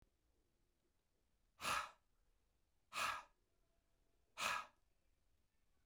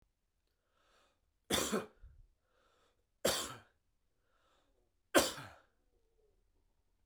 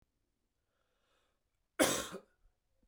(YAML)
exhalation_length: 5.9 s
exhalation_amplitude: 1572
exhalation_signal_mean_std_ratio: 0.31
three_cough_length: 7.1 s
three_cough_amplitude: 6835
three_cough_signal_mean_std_ratio: 0.25
cough_length: 2.9 s
cough_amplitude: 6021
cough_signal_mean_std_ratio: 0.24
survey_phase: beta (2021-08-13 to 2022-03-07)
age: 45-64
gender: Male
wearing_mask: 'No'
symptom_cough_any: true
symptom_runny_or_blocked_nose: true
symptom_change_to_sense_of_smell_or_taste: true
symptom_loss_of_taste: true
symptom_onset: 2 days
smoker_status: Never smoked
respiratory_condition_asthma: false
respiratory_condition_other: false
recruitment_source: Test and Trace
submission_delay: 1 day
covid_test_result: Positive
covid_test_method: RT-qPCR